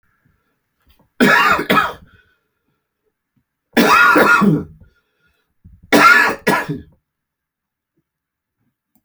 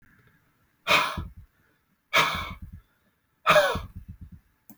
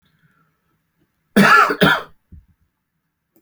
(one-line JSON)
{"three_cough_length": "9.0 s", "three_cough_amplitude": 31197, "three_cough_signal_mean_std_ratio": 0.41, "exhalation_length": "4.8 s", "exhalation_amplitude": 16430, "exhalation_signal_mean_std_ratio": 0.37, "cough_length": "3.4 s", "cough_amplitude": 32768, "cough_signal_mean_std_ratio": 0.34, "survey_phase": "beta (2021-08-13 to 2022-03-07)", "age": "45-64", "gender": "Male", "wearing_mask": "No", "symptom_headache": true, "symptom_onset": "10 days", "smoker_status": "Ex-smoker", "respiratory_condition_asthma": false, "respiratory_condition_other": false, "recruitment_source": "REACT", "submission_delay": "2 days", "covid_test_result": "Negative", "covid_test_method": "RT-qPCR"}